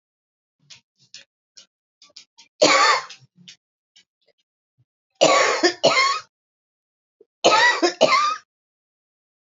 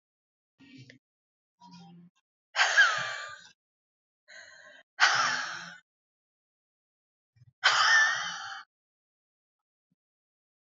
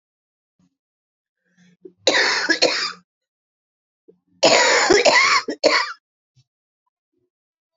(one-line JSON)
{"three_cough_length": "9.5 s", "three_cough_amplitude": 25721, "three_cough_signal_mean_std_ratio": 0.38, "exhalation_length": "10.7 s", "exhalation_amplitude": 13949, "exhalation_signal_mean_std_ratio": 0.34, "cough_length": "7.8 s", "cough_amplitude": 29227, "cough_signal_mean_std_ratio": 0.41, "survey_phase": "beta (2021-08-13 to 2022-03-07)", "age": "45-64", "gender": "Female", "wearing_mask": "No", "symptom_cough_any": true, "symptom_new_continuous_cough": true, "symptom_runny_or_blocked_nose": true, "symptom_shortness_of_breath": true, "symptom_fatigue": true, "symptom_fever_high_temperature": true, "symptom_headache": true, "symptom_change_to_sense_of_smell_or_taste": true, "symptom_loss_of_taste": true, "symptom_onset": "4 days", "smoker_status": "Ex-smoker", "respiratory_condition_asthma": false, "respiratory_condition_other": false, "recruitment_source": "Test and Trace", "submission_delay": "1 day", "covid_test_result": "Positive", "covid_test_method": "RT-qPCR", "covid_ct_value": 16.2, "covid_ct_gene": "ORF1ab gene", "covid_ct_mean": 16.7, "covid_viral_load": "3300000 copies/ml", "covid_viral_load_category": "High viral load (>1M copies/ml)"}